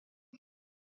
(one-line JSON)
{"cough_length": "0.9 s", "cough_amplitude": 195, "cough_signal_mean_std_ratio": 0.17, "survey_phase": "beta (2021-08-13 to 2022-03-07)", "age": "65+", "gender": "Female", "wearing_mask": "No", "symptom_none": true, "smoker_status": "Ex-smoker", "respiratory_condition_asthma": false, "respiratory_condition_other": false, "recruitment_source": "REACT", "submission_delay": "2 days", "covid_test_result": "Negative", "covid_test_method": "RT-qPCR"}